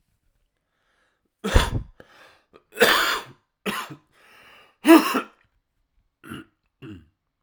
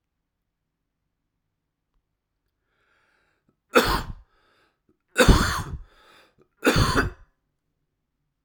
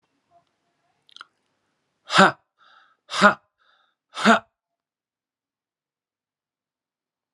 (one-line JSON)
{"cough_length": "7.4 s", "cough_amplitude": 29742, "cough_signal_mean_std_ratio": 0.29, "three_cough_length": "8.4 s", "three_cough_amplitude": 30207, "three_cough_signal_mean_std_ratio": 0.28, "exhalation_length": "7.3 s", "exhalation_amplitude": 32767, "exhalation_signal_mean_std_ratio": 0.2, "survey_phase": "alpha (2021-03-01 to 2021-08-12)", "age": "45-64", "gender": "Male", "wearing_mask": "No", "symptom_cough_any": true, "symptom_new_continuous_cough": true, "symptom_shortness_of_breath": true, "symptom_fatigue": true, "symptom_change_to_sense_of_smell_or_taste": true, "symptom_loss_of_taste": true, "symptom_onset": "5 days", "smoker_status": "Ex-smoker", "respiratory_condition_asthma": false, "respiratory_condition_other": false, "recruitment_source": "Test and Trace", "submission_delay": "2 days", "covid_test_result": "Positive", "covid_test_method": "RT-qPCR"}